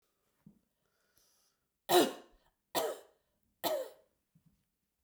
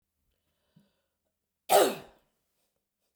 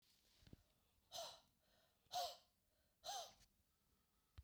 {"three_cough_length": "5.0 s", "three_cough_amplitude": 7134, "three_cough_signal_mean_std_ratio": 0.26, "cough_length": "3.2 s", "cough_amplitude": 11497, "cough_signal_mean_std_ratio": 0.22, "exhalation_length": "4.4 s", "exhalation_amplitude": 546, "exhalation_signal_mean_std_ratio": 0.37, "survey_phase": "beta (2021-08-13 to 2022-03-07)", "age": "45-64", "gender": "Female", "wearing_mask": "No", "symptom_none": true, "smoker_status": "Never smoked", "respiratory_condition_asthma": true, "respiratory_condition_other": false, "recruitment_source": "REACT", "submission_delay": "2 days", "covid_test_result": "Negative", "covid_test_method": "RT-qPCR"}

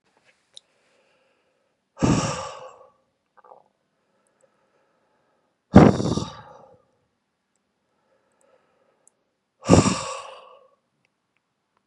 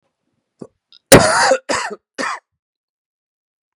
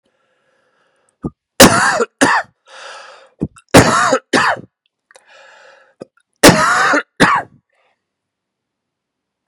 {"exhalation_length": "11.9 s", "exhalation_amplitude": 32768, "exhalation_signal_mean_std_ratio": 0.22, "cough_length": "3.8 s", "cough_amplitude": 32768, "cough_signal_mean_std_ratio": 0.32, "three_cough_length": "9.5 s", "three_cough_amplitude": 32768, "three_cough_signal_mean_std_ratio": 0.38, "survey_phase": "beta (2021-08-13 to 2022-03-07)", "age": "45-64", "gender": "Male", "wearing_mask": "No", "symptom_cough_any": true, "symptom_runny_or_blocked_nose": true, "symptom_fever_high_temperature": true, "symptom_change_to_sense_of_smell_or_taste": true, "symptom_other": true, "symptom_onset": "7 days", "smoker_status": "Never smoked", "respiratory_condition_asthma": false, "respiratory_condition_other": false, "recruitment_source": "Test and Trace", "submission_delay": "3 days", "covid_test_result": "Positive", "covid_test_method": "RT-qPCR", "covid_ct_value": 20.3, "covid_ct_gene": "ORF1ab gene"}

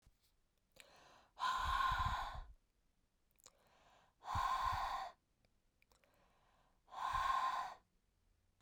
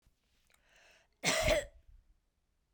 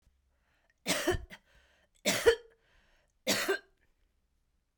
{"exhalation_length": "8.6 s", "exhalation_amplitude": 1623, "exhalation_signal_mean_std_ratio": 0.5, "cough_length": "2.7 s", "cough_amplitude": 4903, "cough_signal_mean_std_ratio": 0.33, "three_cough_length": "4.8 s", "three_cough_amplitude": 10003, "three_cough_signal_mean_std_ratio": 0.33, "survey_phase": "beta (2021-08-13 to 2022-03-07)", "age": "45-64", "gender": "Female", "wearing_mask": "No", "symptom_none": true, "smoker_status": "Never smoked", "respiratory_condition_asthma": false, "respiratory_condition_other": false, "recruitment_source": "REACT", "submission_delay": "3 days", "covid_test_result": "Negative", "covid_test_method": "RT-qPCR"}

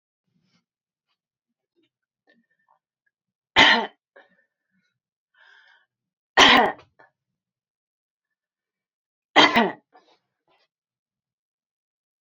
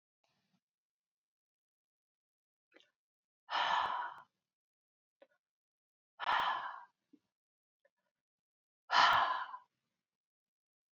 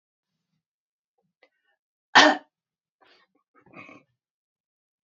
{"three_cough_length": "12.2 s", "three_cough_amplitude": 29213, "three_cough_signal_mean_std_ratio": 0.21, "exhalation_length": "10.9 s", "exhalation_amplitude": 5829, "exhalation_signal_mean_std_ratio": 0.29, "cough_length": "5.0 s", "cough_amplitude": 27659, "cough_signal_mean_std_ratio": 0.16, "survey_phase": "beta (2021-08-13 to 2022-03-07)", "age": "45-64", "gender": "Female", "wearing_mask": "No", "symptom_none": true, "smoker_status": "Never smoked", "respiratory_condition_asthma": false, "respiratory_condition_other": false, "recruitment_source": "REACT", "submission_delay": "2 days", "covid_test_result": "Negative", "covid_test_method": "RT-qPCR", "influenza_a_test_result": "Negative", "influenza_b_test_result": "Negative"}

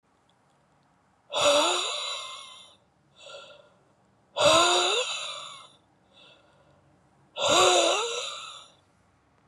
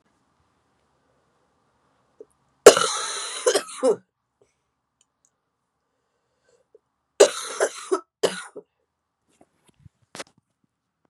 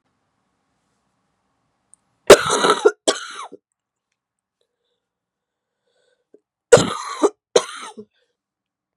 {"exhalation_length": "9.5 s", "exhalation_amplitude": 13884, "exhalation_signal_mean_std_ratio": 0.45, "three_cough_length": "11.1 s", "three_cough_amplitude": 32768, "three_cough_signal_mean_std_ratio": 0.21, "cough_length": "9.0 s", "cough_amplitude": 32768, "cough_signal_mean_std_ratio": 0.23, "survey_phase": "beta (2021-08-13 to 2022-03-07)", "age": "45-64", "gender": "Female", "wearing_mask": "No", "symptom_cough_any": true, "symptom_runny_or_blocked_nose": true, "symptom_shortness_of_breath": true, "symptom_sore_throat": true, "symptom_diarrhoea": true, "symptom_fatigue": true, "symptom_fever_high_temperature": true, "symptom_headache": true, "symptom_change_to_sense_of_smell_or_taste": true, "symptom_loss_of_taste": true, "symptom_onset": "2 days", "smoker_status": "Ex-smoker", "respiratory_condition_asthma": false, "respiratory_condition_other": false, "recruitment_source": "Test and Trace", "submission_delay": "1 day", "covid_test_result": "Positive", "covid_test_method": "RT-qPCR", "covid_ct_value": 14.1, "covid_ct_gene": "ORF1ab gene", "covid_ct_mean": 14.4, "covid_viral_load": "19000000 copies/ml", "covid_viral_load_category": "High viral load (>1M copies/ml)"}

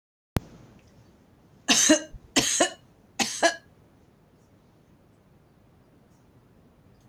{"three_cough_length": "7.1 s", "three_cough_amplitude": 18207, "three_cough_signal_mean_std_ratio": 0.3, "survey_phase": "beta (2021-08-13 to 2022-03-07)", "age": "65+", "gender": "Female", "wearing_mask": "No", "symptom_none": true, "smoker_status": "Ex-smoker", "respiratory_condition_asthma": false, "respiratory_condition_other": false, "recruitment_source": "REACT", "submission_delay": "2 days", "covid_test_result": "Negative", "covid_test_method": "RT-qPCR", "influenza_a_test_result": "Negative", "influenza_b_test_result": "Negative"}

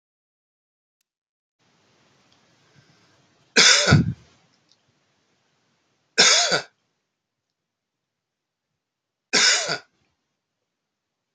{"three_cough_length": "11.3 s", "three_cough_amplitude": 27451, "three_cough_signal_mean_std_ratio": 0.27, "survey_phase": "beta (2021-08-13 to 2022-03-07)", "age": "45-64", "gender": "Male", "wearing_mask": "No", "symptom_cough_any": true, "symptom_runny_or_blocked_nose": true, "symptom_fatigue": true, "symptom_fever_high_temperature": true, "symptom_change_to_sense_of_smell_or_taste": true, "symptom_loss_of_taste": true, "symptom_onset": "4 days", "smoker_status": "Never smoked", "respiratory_condition_asthma": false, "respiratory_condition_other": false, "recruitment_source": "Test and Trace", "submission_delay": "2 days", "covid_test_result": "Positive", "covid_test_method": "RT-qPCR", "covid_ct_value": 22.2, "covid_ct_gene": "N gene"}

